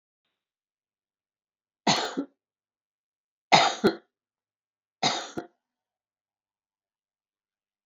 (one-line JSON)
{"three_cough_length": "7.9 s", "three_cough_amplitude": 26606, "three_cough_signal_mean_std_ratio": 0.23, "survey_phase": "alpha (2021-03-01 to 2021-08-12)", "age": "65+", "gender": "Female", "wearing_mask": "No", "symptom_none": true, "smoker_status": "Ex-smoker", "respiratory_condition_asthma": false, "respiratory_condition_other": false, "recruitment_source": "REACT", "covid_test_method": "RT-qPCR"}